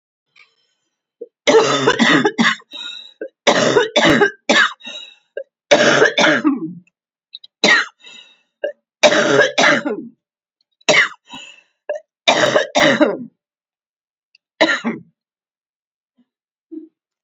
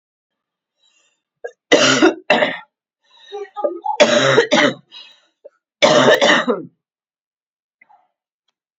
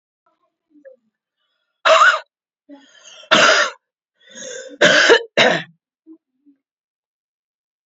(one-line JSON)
{"cough_length": "17.2 s", "cough_amplitude": 32768, "cough_signal_mean_std_ratio": 0.47, "three_cough_length": "8.8 s", "three_cough_amplitude": 30135, "three_cough_signal_mean_std_ratio": 0.42, "exhalation_length": "7.9 s", "exhalation_amplitude": 29769, "exhalation_signal_mean_std_ratio": 0.35, "survey_phase": "beta (2021-08-13 to 2022-03-07)", "age": "18-44", "gender": "Female", "wearing_mask": "No", "symptom_cough_any": true, "symptom_runny_or_blocked_nose": true, "symptom_sore_throat": true, "symptom_fatigue": true, "symptom_onset": "4 days", "smoker_status": "Ex-smoker", "respiratory_condition_asthma": false, "respiratory_condition_other": false, "recruitment_source": "Test and Trace", "submission_delay": "2 days", "covid_test_result": "Positive", "covid_test_method": "RT-qPCR", "covid_ct_value": 29.1, "covid_ct_gene": "ORF1ab gene", "covid_ct_mean": 29.1, "covid_viral_load": "280 copies/ml", "covid_viral_load_category": "Minimal viral load (< 10K copies/ml)"}